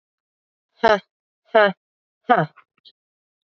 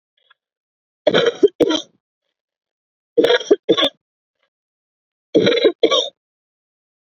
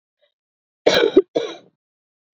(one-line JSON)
{"exhalation_length": "3.6 s", "exhalation_amplitude": 27347, "exhalation_signal_mean_std_ratio": 0.27, "three_cough_length": "7.1 s", "three_cough_amplitude": 28580, "three_cough_signal_mean_std_ratio": 0.36, "cough_length": "2.4 s", "cough_amplitude": 31646, "cough_signal_mean_std_ratio": 0.31, "survey_phase": "beta (2021-08-13 to 2022-03-07)", "age": "18-44", "gender": "Female", "wearing_mask": "No", "symptom_cough_any": true, "symptom_runny_or_blocked_nose": true, "symptom_shortness_of_breath": true, "symptom_sore_throat": true, "symptom_fatigue": true, "symptom_headache": true, "symptom_onset": "3 days", "smoker_status": "Current smoker (1 to 10 cigarettes per day)", "respiratory_condition_asthma": true, "respiratory_condition_other": false, "recruitment_source": "Test and Trace", "submission_delay": "2 days", "covid_test_result": "Positive", "covid_test_method": "RT-qPCR", "covid_ct_value": 22.5, "covid_ct_gene": "ORF1ab gene"}